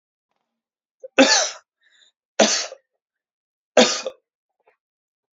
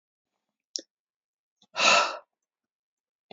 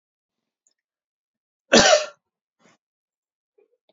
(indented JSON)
{
  "three_cough_length": "5.4 s",
  "three_cough_amplitude": 29820,
  "three_cough_signal_mean_std_ratio": 0.28,
  "exhalation_length": "3.3 s",
  "exhalation_amplitude": 15518,
  "exhalation_signal_mean_std_ratio": 0.26,
  "cough_length": "3.9 s",
  "cough_amplitude": 32256,
  "cough_signal_mean_std_ratio": 0.22,
  "survey_phase": "beta (2021-08-13 to 2022-03-07)",
  "age": "18-44",
  "gender": "Male",
  "wearing_mask": "No",
  "symptom_fatigue": true,
  "symptom_headache": true,
  "smoker_status": "Current smoker (e-cigarettes or vapes only)",
  "respiratory_condition_asthma": false,
  "respiratory_condition_other": false,
  "recruitment_source": "REACT",
  "submission_delay": "2 days",
  "covid_test_result": "Negative",
  "covid_test_method": "RT-qPCR"
}